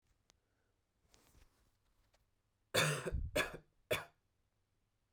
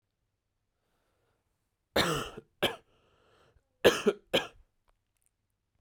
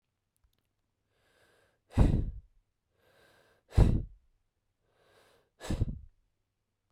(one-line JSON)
{"three_cough_length": "5.1 s", "three_cough_amplitude": 4365, "three_cough_signal_mean_std_ratio": 0.31, "cough_length": "5.8 s", "cough_amplitude": 12882, "cough_signal_mean_std_ratio": 0.25, "exhalation_length": "6.9 s", "exhalation_amplitude": 11246, "exhalation_signal_mean_std_ratio": 0.25, "survey_phase": "beta (2021-08-13 to 2022-03-07)", "age": "18-44", "gender": "Male", "wearing_mask": "No", "symptom_shortness_of_breath": true, "smoker_status": "Never smoked", "respiratory_condition_asthma": false, "respiratory_condition_other": false, "recruitment_source": "REACT", "submission_delay": "4 days", "covid_test_result": "Negative", "covid_test_method": "RT-qPCR"}